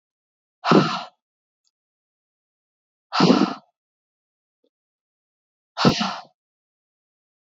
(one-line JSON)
{"exhalation_length": "7.6 s", "exhalation_amplitude": 25835, "exhalation_signal_mean_std_ratio": 0.27, "survey_phase": "beta (2021-08-13 to 2022-03-07)", "age": "18-44", "gender": "Female", "wearing_mask": "No", "symptom_cough_any": true, "symptom_runny_or_blocked_nose": true, "symptom_shortness_of_breath": true, "symptom_sore_throat": true, "symptom_headache": true, "symptom_onset": "2 days", "smoker_status": "Never smoked", "respiratory_condition_asthma": false, "respiratory_condition_other": false, "recruitment_source": "Test and Trace", "submission_delay": "1 day", "covid_test_result": "Positive", "covid_test_method": "RT-qPCR", "covid_ct_value": 28.7, "covid_ct_gene": "N gene", "covid_ct_mean": 28.9, "covid_viral_load": "340 copies/ml", "covid_viral_load_category": "Minimal viral load (< 10K copies/ml)"}